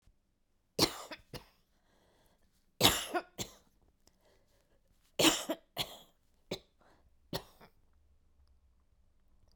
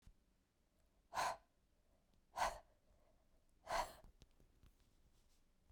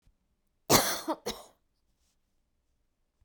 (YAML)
three_cough_length: 9.6 s
three_cough_amplitude: 13416
three_cough_signal_mean_std_ratio: 0.25
exhalation_length: 5.7 s
exhalation_amplitude: 1692
exhalation_signal_mean_std_ratio: 0.31
cough_length: 3.2 s
cough_amplitude: 18043
cough_signal_mean_std_ratio: 0.26
survey_phase: beta (2021-08-13 to 2022-03-07)
age: 45-64
gender: Female
wearing_mask: 'No'
symptom_cough_any: true
symptom_runny_or_blocked_nose: true
symptom_shortness_of_breath: true
symptom_sore_throat: true
symptom_abdominal_pain: true
symptom_diarrhoea: true
symptom_fatigue: true
symptom_onset: 8 days
smoker_status: Never smoked
respiratory_condition_asthma: true
respiratory_condition_other: false
recruitment_source: REACT
submission_delay: 0 days
covid_test_result: Negative
covid_test_method: RT-qPCR